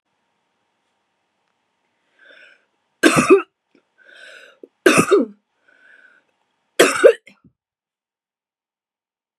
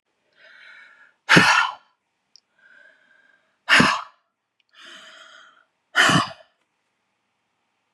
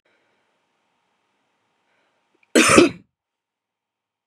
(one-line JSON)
{"three_cough_length": "9.4 s", "three_cough_amplitude": 32768, "three_cough_signal_mean_std_ratio": 0.25, "exhalation_length": "7.9 s", "exhalation_amplitude": 32615, "exhalation_signal_mean_std_ratio": 0.29, "cough_length": "4.3 s", "cough_amplitude": 32767, "cough_signal_mean_std_ratio": 0.22, "survey_phase": "beta (2021-08-13 to 2022-03-07)", "age": "45-64", "gender": "Female", "wearing_mask": "No", "symptom_cough_any": true, "symptom_runny_or_blocked_nose": true, "symptom_sore_throat": true, "symptom_fatigue": true, "symptom_headache": true, "symptom_other": true, "smoker_status": "Never smoked", "respiratory_condition_asthma": false, "respiratory_condition_other": false, "recruitment_source": "Test and Trace", "submission_delay": "1 day", "covid_test_result": "Positive", "covid_test_method": "RT-qPCR"}